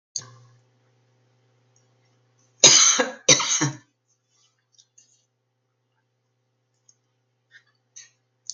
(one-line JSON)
{"cough_length": "8.5 s", "cough_amplitude": 32767, "cough_signal_mean_std_ratio": 0.23, "survey_phase": "beta (2021-08-13 to 2022-03-07)", "age": "65+", "gender": "Female", "wearing_mask": "No", "symptom_none": true, "smoker_status": "Ex-smoker", "respiratory_condition_asthma": false, "respiratory_condition_other": false, "recruitment_source": "REACT", "submission_delay": "2 days", "covid_test_result": "Negative", "covid_test_method": "RT-qPCR", "influenza_a_test_result": "Negative", "influenza_b_test_result": "Positive", "influenza_b_ct_value": 35.7}